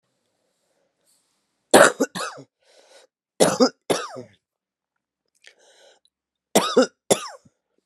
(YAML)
three_cough_length: 7.9 s
three_cough_amplitude: 32752
three_cough_signal_mean_std_ratio: 0.27
survey_phase: beta (2021-08-13 to 2022-03-07)
age: 45-64
gender: Female
wearing_mask: 'No'
symptom_cough_any: true
symptom_runny_or_blocked_nose: true
symptom_shortness_of_breath: true
symptom_sore_throat: true
symptom_abdominal_pain: true
symptom_fatigue: true
symptom_fever_high_temperature: true
symptom_headache: true
symptom_change_to_sense_of_smell_or_taste: true
symptom_onset: 3 days
smoker_status: Never smoked
respiratory_condition_asthma: false
respiratory_condition_other: false
recruitment_source: Test and Trace
submission_delay: 2 days
covid_test_result: Positive
covid_test_method: RT-qPCR
covid_ct_value: 14.7
covid_ct_gene: ORF1ab gene
covid_ct_mean: 15.0
covid_viral_load: 12000000 copies/ml
covid_viral_load_category: High viral load (>1M copies/ml)